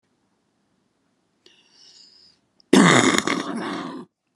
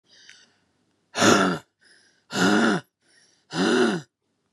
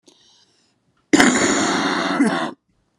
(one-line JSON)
{"cough_length": "4.4 s", "cough_amplitude": 32768, "cough_signal_mean_std_ratio": 0.34, "exhalation_length": "4.5 s", "exhalation_amplitude": 21341, "exhalation_signal_mean_std_ratio": 0.46, "three_cough_length": "3.0 s", "three_cough_amplitude": 32768, "three_cough_signal_mean_std_ratio": 0.57, "survey_phase": "beta (2021-08-13 to 2022-03-07)", "age": "18-44", "gender": "Female", "wearing_mask": "No", "symptom_cough_any": true, "symptom_fatigue": true, "symptom_fever_high_temperature": true, "symptom_change_to_sense_of_smell_or_taste": true, "symptom_loss_of_taste": true, "symptom_other": true, "symptom_onset": "2 days", "smoker_status": "Never smoked", "respiratory_condition_asthma": false, "respiratory_condition_other": false, "recruitment_source": "Test and Trace", "submission_delay": "1 day", "covid_test_result": "Positive", "covid_test_method": "RT-qPCR", "covid_ct_value": 18.4, "covid_ct_gene": "N gene"}